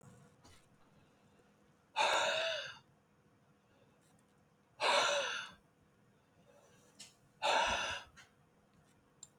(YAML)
exhalation_length: 9.4 s
exhalation_amplitude: 3751
exhalation_signal_mean_std_ratio: 0.4
survey_phase: beta (2021-08-13 to 2022-03-07)
age: 65+
gender: Male
wearing_mask: 'No'
symptom_none: true
smoker_status: Never smoked
respiratory_condition_asthma: false
respiratory_condition_other: false
recruitment_source: REACT
submission_delay: 2 days
covid_test_result: Negative
covid_test_method: RT-qPCR
influenza_a_test_result: Negative
influenza_b_test_result: Negative